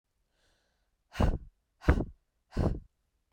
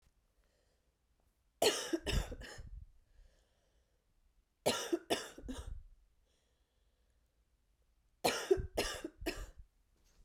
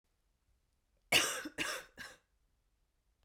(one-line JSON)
{"exhalation_length": "3.3 s", "exhalation_amplitude": 10178, "exhalation_signal_mean_std_ratio": 0.33, "three_cough_length": "10.2 s", "three_cough_amplitude": 4911, "three_cough_signal_mean_std_ratio": 0.35, "cough_length": "3.2 s", "cough_amplitude": 6171, "cough_signal_mean_std_ratio": 0.3, "survey_phase": "beta (2021-08-13 to 2022-03-07)", "age": "18-44", "gender": "Female", "wearing_mask": "No", "symptom_cough_any": true, "symptom_runny_or_blocked_nose": true, "symptom_sore_throat": true, "symptom_fatigue": true, "symptom_onset": "5 days", "smoker_status": "Never smoked", "respiratory_condition_asthma": false, "respiratory_condition_other": false, "recruitment_source": "Test and Trace", "submission_delay": "2 days", "covid_test_result": "Positive", "covid_test_method": "RT-qPCR"}